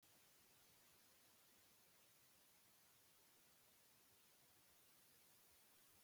{
  "cough_length": "6.0 s",
  "cough_amplitude": 36,
  "cough_signal_mean_std_ratio": 1.23,
  "survey_phase": "beta (2021-08-13 to 2022-03-07)",
  "age": "65+",
  "gender": "Male",
  "wearing_mask": "No",
  "symptom_cough_any": true,
  "symptom_abdominal_pain": true,
  "symptom_fatigue": true,
  "smoker_status": "Ex-smoker",
  "respiratory_condition_asthma": false,
  "respiratory_condition_other": false,
  "recruitment_source": "REACT",
  "submission_delay": "4 days",
  "covid_test_result": "Negative",
  "covid_test_method": "RT-qPCR",
  "influenza_a_test_result": "Negative",
  "influenza_b_test_result": "Negative"
}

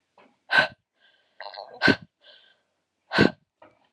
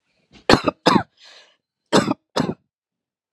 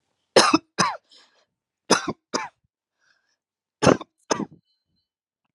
{
  "exhalation_length": "3.9 s",
  "exhalation_amplitude": 21625,
  "exhalation_signal_mean_std_ratio": 0.27,
  "cough_length": "3.3 s",
  "cough_amplitude": 32768,
  "cough_signal_mean_std_ratio": 0.31,
  "three_cough_length": "5.5 s",
  "three_cough_amplitude": 29556,
  "three_cough_signal_mean_std_ratio": 0.27,
  "survey_phase": "alpha (2021-03-01 to 2021-08-12)",
  "age": "45-64",
  "gender": "Female",
  "wearing_mask": "No",
  "symptom_diarrhoea": true,
  "smoker_status": "Never smoked",
  "respiratory_condition_asthma": false,
  "respiratory_condition_other": false,
  "recruitment_source": "REACT",
  "submission_delay": "5 days",
  "covid_test_result": "Negative",
  "covid_test_method": "RT-qPCR"
}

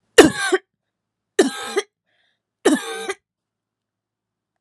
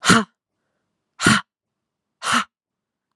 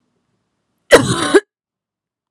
{
  "three_cough_length": "4.6 s",
  "three_cough_amplitude": 32768,
  "three_cough_signal_mean_std_ratio": 0.29,
  "exhalation_length": "3.2 s",
  "exhalation_amplitude": 32671,
  "exhalation_signal_mean_std_ratio": 0.32,
  "cough_length": "2.3 s",
  "cough_amplitude": 32768,
  "cough_signal_mean_std_ratio": 0.3,
  "survey_phase": "beta (2021-08-13 to 2022-03-07)",
  "age": "18-44",
  "gender": "Female",
  "wearing_mask": "Yes",
  "symptom_runny_or_blocked_nose": true,
  "symptom_shortness_of_breath": true,
  "symptom_sore_throat": true,
  "symptom_onset": "12 days",
  "smoker_status": "Ex-smoker",
  "respiratory_condition_asthma": false,
  "respiratory_condition_other": true,
  "recruitment_source": "REACT",
  "submission_delay": "1 day",
  "covid_test_result": "Negative",
  "covid_test_method": "RT-qPCR"
}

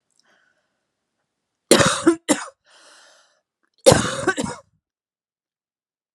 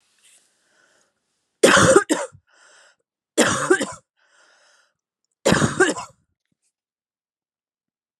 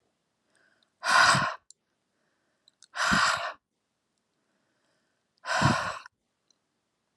{
  "cough_length": "6.1 s",
  "cough_amplitude": 32768,
  "cough_signal_mean_std_ratio": 0.28,
  "three_cough_length": "8.2 s",
  "three_cough_amplitude": 31156,
  "three_cough_signal_mean_std_ratio": 0.31,
  "exhalation_length": "7.2 s",
  "exhalation_amplitude": 12786,
  "exhalation_signal_mean_std_ratio": 0.35,
  "survey_phase": "alpha (2021-03-01 to 2021-08-12)",
  "age": "18-44",
  "gender": "Female",
  "wearing_mask": "No",
  "symptom_cough_any": true,
  "symptom_abdominal_pain": true,
  "smoker_status": "Never smoked",
  "respiratory_condition_asthma": false,
  "respiratory_condition_other": false,
  "recruitment_source": "Test and Trace",
  "submission_delay": "1 day",
  "covid_ct_value": 33.1,
  "covid_ct_gene": "ORF1ab gene"
}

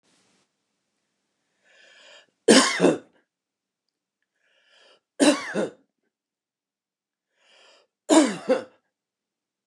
{
  "three_cough_length": "9.7 s",
  "three_cough_amplitude": 28188,
  "three_cough_signal_mean_std_ratio": 0.26,
  "survey_phase": "beta (2021-08-13 to 2022-03-07)",
  "age": "65+",
  "gender": "Male",
  "wearing_mask": "No",
  "symptom_none": true,
  "smoker_status": "Ex-smoker",
  "respiratory_condition_asthma": false,
  "respiratory_condition_other": false,
  "recruitment_source": "REACT",
  "submission_delay": "2 days",
  "covid_test_result": "Negative",
  "covid_test_method": "RT-qPCR",
  "influenza_a_test_result": "Negative",
  "influenza_b_test_result": "Negative"
}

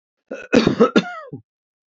{
  "cough_length": "1.9 s",
  "cough_amplitude": 27547,
  "cough_signal_mean_std_ratio": 0.39,
  "survey_phase": "beta (2021-08-13 to 2022-03-07)",
  "age": "65+",
  "gender": "Male",
  "wearing_mask": "No",
  "symptom_none": true,
  "smoker_status": "Never smoked",
  "respiratory_condition_asthma": false,
  "respiratory_condition_other": false,
  "recruitment_source": "REACT",
  "submission_delay": "2 days",
  "covid_test_result": "Negative",
  "covid_test_method": "RT-qPCR",
  "influenza_a_test_result": "Negative",
  "influenza_b_test_result": "Negative"
}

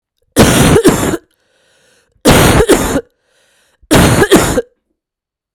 {
  "three_cough_length": "5.5 s",
  "three_cough_amplitude": 32768,
  "three_cough_signal_mean_std_ratio": 0.54,
  "survey_phase": "beta (2021-08-13 to 2022-03-07)",
  "age": "45-64",
  "gender": "Female",
  "wearing_mask": "No",
  "symptom_cough_any": true,
  "symptom_runny_or_blocked_nose": true,
  "symptom_sore_throat": true,
  "symptom_change_to_sense_of_smell_or_taste": true,
  "symptom_loss_of_taste": true,
  "symptom_onset": "6 days",
  "smoker_status": "Never smoked",
  "respiratory_condition_asthma": false,
  "respiratory_condition_other": false,
  "recruitment_source": "Test and Trace",
  "submission_delay": "2 days",
  "covid_test_result": "Positive",
  "covid_test_method": "RT-qPCR"
}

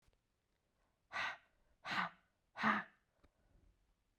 {
  "exhalation_length": "4.2 s",
  "exhalation_amplitude": 2444,
  "exhalation_signal_mean_std_ratio": 0.32,
  "survey_phase": "beta (2021-08-13 to 2022-03-07)",
  "age": "18-44",
  "gender": "Female",
  "wearing_mask": "No",
  "symptom_cough_any": true,
  "symptom_runny_or_blocked_nose": true,
  "symptom_fatigue": true,
  "symptom_fever_high_temperature": true,
  "symptom_headache": true,
  "symptom_onset": "3 days",
  "smoker_status": "Never smoked",
  "respiratory_condition_asthma": false,
  "respiratory_condition_other": false,
  "recruitment_source": "Test and Trace",
  "submission_delay": "2 days",
  "covid_test_result": "Positive",
  "covid_test_method": "RT-qPCR",
  "covid_ct_value": 20.7,
  "covid_ct_gene": "ORF1ab gene"
}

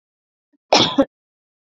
{
  "cough_length": "1.7 s",
  "cough_amplitude": 32767,
  "cough_signal_mean_std_ratio": 0.3,
  "survey_phase": "beta (2021-08-13 to 2022-03-07)",
  "age": "18-44",
  "gender": "Female",
  "wearing_mask": "Yes",
  "symptom_runny_or_blocked_nose": true,
  "symptom_sore_throat": true,
  "symptom_onset": "4 days",
  "smoker_status": "Never smoked",
  "respiratory_condition_asthma": false,
  "respiratory_condition_other": false,
  "recruitment_source": "REACT",
  "submission_delay": "1 day",
  "covid_test_result": "Negative",
  "covid_test_method": "RT-qPCR",
  "influenza_a_test_result": "Negative",
  "influenza_b_test_result": "Negative"
}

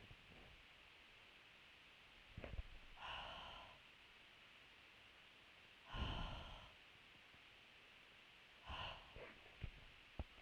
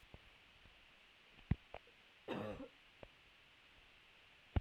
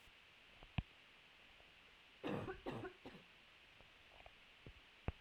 {
  "exhalation_length": "10.4 s",
  "exhalation_amplitude": 688,
  "exhalation_signal_mean_std_ratio": 0.65,
  "cough_length": "4.6 s",
  "cough_amplitude": 2653,
  "cough_signal_mean_std_ratio": 0.3,
  "three_cough_length": "5.2 s",
  "three_cough_amplitude": 1740,
  "three_cough_signal_mean_std_ratio": 0.46,
  "survey_phase": "beta (2021-08-13 to 2022-03-07)",
  "age": "18-44",
  "gender": "Female",
  "wearing_mask": "No",
  "symptom_cough_any": true,
  "symptom_runny_or_blocked_nose": true,
  "symptom_shortness_of_breath": true,
  "symptom_sore_throat": true,
  "symptom_fatigue": true,
  "symptom_headache": true,
  "symptom_change_to_sense_of_smell_or_taste": true,
  "symptom_loss_of_taste": true,
  "symptom_other": true,
  "symptom_onset": "4 days",
  "smoker_status": "Never smoked",
  "respiratory_condition_asthma": false,
  "respiratory_condition_other": false,
  "recruitment_source": "Test and Trace",
  "submission_delay": "2 days",
  "covid_test_result": "Positive",
  "covid_test_method": "RT-qPCR"
}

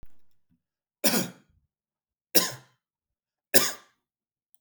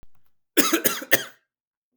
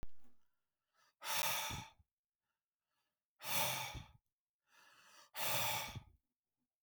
{
  "three_cough_length": "4.6 s",
  "three_cough_amplitude": 30304,
  "three_cough_signal_mean_std_ratio": 0.25,
  "cough_length": "2.0 s",
  "cough_amplitude": 32766,
  "cough_signal_mean_std_ratio": 0.36,
  "exhalation_length": "6.8 s",
  "exhalation_amplitude": 2446,
  "exhalation_signal_mean_std_ratio": 0.47,
  "survey_phase": "beta (2021-08-13 to 2022-03-07)",
  "age": "18-44",
  "gender": "Male",
  "wearing_mask": "No",
  "symptom_none": true,
  "smoker_status": "Ex-smoker",
  "respiratory_condition_asthma": false,
  "respiratory_condition_other": false,
  "recruitment_source": "REACT",
  "submission_delay": "1 day",
  "covid_test_result": "Negative",
  "covid_test_method": "RT-qPCR",
  "influenza_a_test_result": "Negative",
  "influenza_b_test_result": "Negative"
}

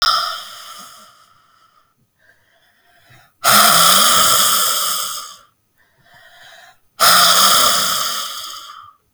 {
  "exhalation_length": "9.1 s",
  "exhalation_amplitude": 32768,
  "exhalation_signal_mean_std_ratio": 0.53,
  "survey_phase": "beta (2021-08-13 to 2022-03-07)",
  "age": "18-44",
  "gender": "Female",
  "wearing_mask": "No",
  "symptom_cough_any": true,
  "symptom_runny_or_blocked_nose": true,
  "symptom_sore_throat": true,
  "symptom_abdominal_pain": true,
  "symptom_fatigue": true,
  "symptom_headache": true,
  "symptom_change_to_sense_of_smell_or_taste": true,
  "symptom_loss_of_taste": true,
  "symptom_onset": "5 days",
  "smoker_status": "Never smoked",
  "respiratory_condition_asthma": false,
  "respiratory_condition_other": false,
  "recruitment_source": "Test and Trace",
  "submission_delay": "2 days",
  "covid_test_result": "Positive",
  "covid_test_method": "RT-qPCR",
  "covid_ct_value": 14.2,
  "covid_ct_gene": "ORF1ab gene"
}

